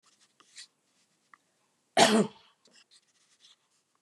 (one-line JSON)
{"cough_length": "4.0 s", "cough_amplitude": 15304, "cough_signal_mean_std_ratio": 0.22, "survey_phase": "beta (2021-08-13 to 2022-03-07)", "age": "45-64", "gender": "Female", "wearing_mask": "No", "symptom_fatigue": true, "smoker_status": "Never smoked", "respiratory_condition_asthma": false, "respiratory_condition_other": false, "recruitment_source": "REACT", "submission_delay": "1 day", "covid_test_result": "Negative", "covid_test_method": "RT-qPCR", "influenza_a_test_result": "Negative", "influenza_b_test_result": "Negative"}